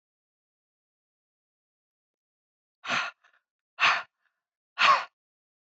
{"exhalation_length": "5.6 s", "exhalation_amplitude": 12906, "exhalation_signal_mean_std_ratio": 0.25, "survey_phase": "beta (2021-08-13 to 2022-03-07)", "age": "18-44", "gender": "Female", "wearing_mask": "No", "symptom_none": true, "smoker_status": "Ex-smoker", "respiratory_condition_asthma": false, "respiratory_condition_other": false, "recruitment_source": "Test and Trace", "submission_delay": "1 day", "covid_test_result": "Negative", "covid_test_method": "RT-qPCR"}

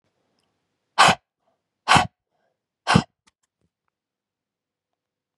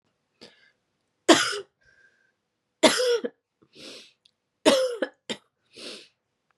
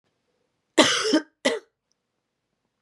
{"exhalation_length": "5.4 s", "exhalation_amplitude": 31678, "exhalation_signal_mean_std_ratio": 0.22, "three_cough_length": "6.6 s", "three_cough_amplitude": 28758, "three_cough_signal_mean_std_ratio": 0.31, "cough_length": "2.8 s", "cough_amplitude": 31176, "cough_signal_mean_std_ratio": 0.33, "survey_phase": "beta (2021-08-13 to 2022-03-07)", "age": "18-44", "gender": "Female", "wearing_mask": "No", "symptom_cough_any": true, "symptom_runny_or_blocked_nose": true, "symptom_shortness_of_breath": true, "symptom_fatigue": true, "symptom_headache": true, "smoker_status": "Never smoked", "respiratory_condition_asthma": false, "respiratory_condition_other": false, "recruitment_source": "Test and Trace", "submission_delay": "2 days", "covid_test_result": "Positive", "covid_test_method": "LFT"}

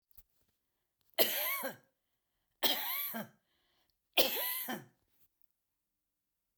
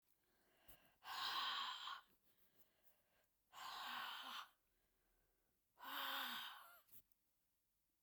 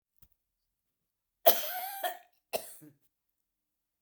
{"three_cough_length": "6.6 s", "three_cough_amplitude": 8677, "three_cough_signal_mean_std_ratio": 0.37, "exhalation_length": "8.0 s", "exhalation_amplitude": 663, "exhalation_signal_mean_std_ratio": 0.51, "cough_length": "4.0 s", "cough_amplitude": 19823, "cough_signal_mean_std_ratio": 0.24, "survey_phase": "beta (2021-08-13 to 2022-03-07)", "age": "65+", "gender": "Female", "wearing_mask": "No", "symptom_none": true, "smoker_status": "Ex-smoker", "respiratory_condition_asthma": false, "respiratory_condition_other": false, "recruitment_source": "REACT", "submission_delay": "2 days", "covid_test_result": "Negative", "covid_test_method": "RT-qPCR", "influenza_a_test_result": "Negative", "influenza_b_test_result": "Negative"}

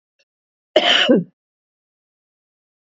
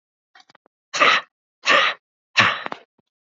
{"cough_length": "2.9 s", "cough_amplitude": 27006, "cough_signal_mean_std_ratio": 0.31, "exhalation_length": "3.2 s", "exhalation_amplitude": 27080, "exhalation_signal_mean_std_ratio": 0.38, "survey_phase": "beta (2021-08-13 to 2022-03-07)", "age": "65+", "gender": "Female", "wearing_mask": "No", "symptom_none": true, "smoker_status": "Ex-smoker", "respiratory_condition_asthma": false, "respiratory_condition_other": true, "recruitment_source": "REACT", "submission_delay": "2 days", "covid_test_result": "Negative", "covid_test_method": "RT-qPCR", "influenza_a_test_result": "Negative", "influenza_b_test_result": "Negative"}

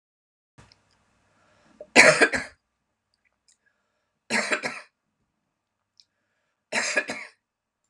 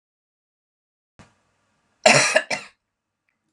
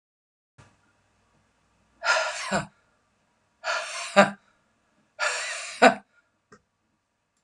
{"three_cough_length": "7.9 s", "three_cough_amplitude": 32284, "three_cough_signal_mean_std_ratio": 0.25, "cough_length": "3.5 s", "cough_amplitude": 32767, "cough_signal_mean_std_ratio": 0.25, "exhalation_length": "7.4 s", "exhalation_amplitude": 32701, "exhalation_signal_mean_std_ratio": 0.29, "survey_phase": "beta (2021-08-13 to 2022-03-07)", "age": "45-64", "gender": "Female", "wearing_mask": "No", "symptom_cough_any": true, "symptom_onset": "10 days", "smoker_status": "Ex-smoker", "respiratory_condition_asthma": false, "respiratory_condition_other": false, "recruitment_source": "REACT", "submission_delay": "1 day", "covid_test_result": "Negative", "covid_test_method": "RT-qPCR"}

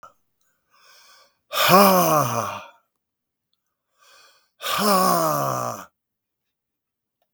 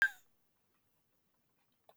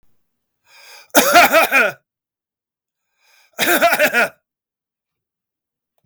{"exhalation_length": "7.3 s", "exhalation_amplitude": 32766, "exhalation_signal_mean_std_ratio": 0.41, "cough_length": "2.0 s", "cough_amplitude": 3747, "cough_signal_mean_std_ratio": 0.17, "three_cough_length": "6.1 s", "three_cough_amplitude": 32768, "three_cough_signal_mean_std_ratio": 0.39, "survey_phase": "beta (2021-08-13 to 2022-03-07)", "age": "65+", "gender": "Male", "wearing_mask": "No", "symptom_none": true, "smoker_status": "Never smoked", "respiratory_condition_asthma": false, "respiratory_condition_other": false, "recruitment_source": "REACT", "submission_delay": "4 days", "covid_test_result": "Negative", "covid_test_method": "RT-qPCR", "influenza_a_test_result": "Unknown/Void", "influenza_b_test_result": "Unknown/Void"}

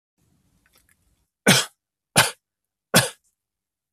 {"three_cough_length": "3.9 s", "three_cough_amplitude": 28191, "three_cough_signal_mean_std_ratio": 0.25, "survey_phase": "beta (2021-08-13 to 2022-03-07)", "age": "45-64", "gender": "Male", "wearing_mask": "No", "symptom_none": true, "smoker_status": "Never smoked", "respiratory_condition_asthma": false, "respiratory_condition_other": false, "recruitment_source": "Test and Trace", "submission_delay": "1 day", "covid_test_result": "Negative", "covid_test_method": "RT-qPCR"}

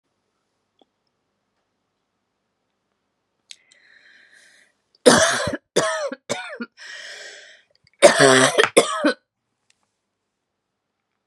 {"three_cough_length": "11.3 s", "three_cough_amplitude": 32768, "three_cough_signal_mean_std_ratio": 0.29, "survey_phase": "beta (2021-08-13 to 2022-03-07)", "age": "45-64", "gender": "Female", "wearing_mask": "No", "symptom_cough_any": true, "symptom_shortness_of_breath": true, "symptom_sore_throat": true, "symptom_fatigue": true, "symptom_headache": true, "symptom_other": true, "smoker_status": "Never smoked", "respiratory_condition_asthma": false, "respiratory_condition_other": false, "recruitment_source": "Test and Trace", "submission_delay": "2 days", "covid_test_result": "Positive", "covid_test_method": "RT-qPCR", "covid_ct_value": 23.6, "covid_ct_gene": "ORF1ab gene", "covid_ct_mean": 24.2, "covid_viral_load": "12000 copies/ml", "covid_viral_load_category": "Low viral load (10K-1M copies/ml)"}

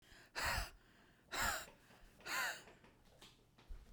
{"exhalation_length": "3.9 s", "exhalation_amplitude": 1546, "exhalation_signal_mean_std_ratio": 0.5, "survey_phase": "beta (2021-08-13 to 2022-03-07)", "age": "18-44", "gender": "Female", "wearing_mask": "No", "symptom_none": true, "smoker_status": "Ex-smoker", "respiratory_condition_asthma": false, "respiratory_condition_other": false, "recruitment_source": "REACT", "submission_delay": "1 day", "covid_test_result": "Negative", "covid_test_method": "RT-qPCR"}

